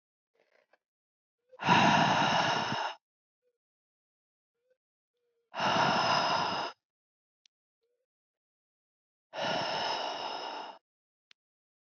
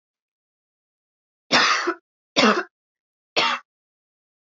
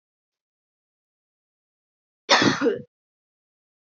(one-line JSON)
{"exhalation_length": "11.9 s", "exhalation_amplitude": 7738, "exhalation_signal_mean_std_ratio": 0.44, "three_cough_length": "4.5 s", "three_cough_amplitude": 26019, "three_cough_signal_mean_std_ratio": 0.34, "cough_length": "3.8 s", "cough_amplitude": 21335, "cough_signal_mean_std_ratio": 0.26, "survey_phase": "alpha (2021-03-01 to 2021-08-12)", "age": "18-44", "gender": "Female", "wearing_mask": "No", "symptom_cough_any": true, "symptom_new_continuous_cough": true, "symptom_shortness_of_breath": true, "symptom_abdominal_pain": true, "symptom_fatigue": true, "symptom_headache": true, "symptom_onset": "2 days", "smoker_status": "Never smoked", "respiratory_condition_asthma": false, "respiratory_condition_other": false, "recruitment_source": "Test and Trace", "submission_delay": "1 day", "covid_test_result": "Positive", "covid_test_method": "RT-qPCR", "covid_ct_value": 20.7, "covid_ct_gene": "ORF1ab gene", "covid_ct_mean": 21.1, "covid_viral_load": "120000 copies/ml", "covid_viral_load_category": "Low viral load (10K-1M copies/ml)"}